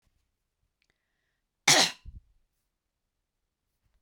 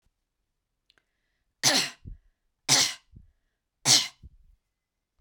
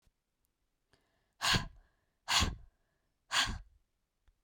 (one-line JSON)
{"cough_length": "4.0 s", "cough_amplitude": 20884, "cough_signal_mean_std_ratio": 0.19, "three_cough_length": "5.2 s", "three_cough_amplitude": 18997, "three_cough_signal_mean_std_ratio": 0.28, "exhalation_length": "4.4 s", "exhalation_amplitude": 7375, "exhalation_signal_mean_std_ratio": 0.33, "survey_phase": "beta (2021-08-13 to 2022-03-07)", "age": "18-44", "gender": "Female", "wearing_mask": "No", "symptom_none": true, "smoker_status": "Never smoked", "respiratory_condition_asthma": false, "respiratory_condition_other": false, "recruitment_source": "REACT", "submission_delay": "1 day", "covid_test_result": "Negative", "covid_test_method": "RT-qPCR"}